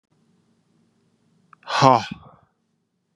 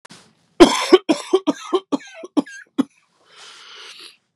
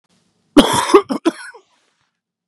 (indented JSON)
{
  "exhalation_length": "3.2 s",
  "exhalation_amplitude": 32390,
  "exhalation_signal_mean_std_ratio": 0.22,
  "three_cough_length": "4.4 s",
  "three_cough_amplitude": 32768,
  "three_cough_signal_mean_std_ratio": 0.31,
  "cough_length": "2.5 s",
  "cough_amplitude": 32768,
  "cough_signal_mean_std_ratio": 0.34,
  "survey_phase": "beta (2021-08-13 to 2022-03-07)",
  "age": "18-44",
  "gender": "Male",
  "wearing_mask": "No",
  "symptom_cough_any": true,
  "symptom_shortness_of_breath": true,
  "symptom_onset": "4 days",
  "smoker_status": "Never smoked",
  "respiratory_condition_asthma": false,
  "respiratory_condition_other": false,
  "recruitment_source": "Test and Trace",
  "submission_delay": "2 days",
  "covid_test_result": "Positive",
  "covid_test_method": "RT-qPCR",
  "covid_ct_value": 17.8,
  "covid_ct_gene": "ORF1ab gene",
  "covid_ct_mean": 18.5,
  "covid_viral_load": "870000 copies/ml",
  "covid_viral_load_category": "Low viral load (10K-1M copies/ml)"
}